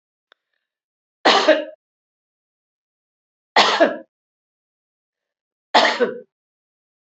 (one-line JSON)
{"three_cough_length": "7.2 s", "three_cough_amplitude": 29002, "three_cough_signal_mean_std_ratio": 0.29, "survey_phase": "beta (2021-08-13 to 2022-03-07)", "age": "65+", "gender": "Female", "wearing_mask": "No", "symptom_none": true, "smoker_status": "Ex-smoker", "respiratory_condition_asthma": false, "respiratory_condition_other": false, "recruitment_source": "REACT", "submission_delay": "2 days", "covid_test_result": "Negative", "covid_test_method": "RT-qPCR", "influenza_a_test_result": "Negative", "influenza_b_test_result": "Negative"}